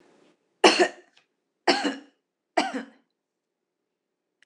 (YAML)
three_cough_length: 4.5 s
three_cough_amplitude: 24662
three_cough_signal_mean_std_ratio: 0.28
survey_phase: alpha (2021-03-01 to 2021-08-12)
age: 45-64
gender: Female
wearing_mask: 'No'
symptom_none: true
smoker_status: Never smoked
respiratory_condition_asthma: false
respiratory_condition_other: false
recruitment_source: REACT
submission_delay: 3 days
covid_test_result: Negative
covid_test_method: RT-qPCR